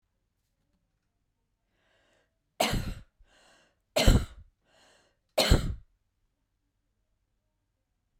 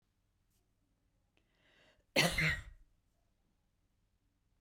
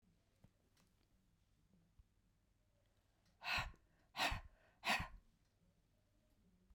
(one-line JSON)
{"three_cough_length": "8.2 s", "three_cough_amplitude": 18066, "three_cough_signal_mean_std_ratio": 0.24, "cough_length": "4.6 s", "cough_amplitude": 5417, "cough_signal_mean_std_ratio": 0.25, "exhalation_length": "6.7 s", "exhalation_amplitude": 1739, "exhalation_signal_mean_std_ratio": 0.29, "survey_phase": "beta (2021-08-13 to 2022-03-07)", "age": "65+", "gender": "Female", "wearing_mask": "No", "symptom_none": true, "smoker_status": "Ex-smoker", "respiratory_condition_asthma": false, "respiratory_condition_other": false, "recruitment_source": "REACT", "submission_delay": "2 days", "covid_test_result": "Negative", "covid_test_method": "RT-qPCR"}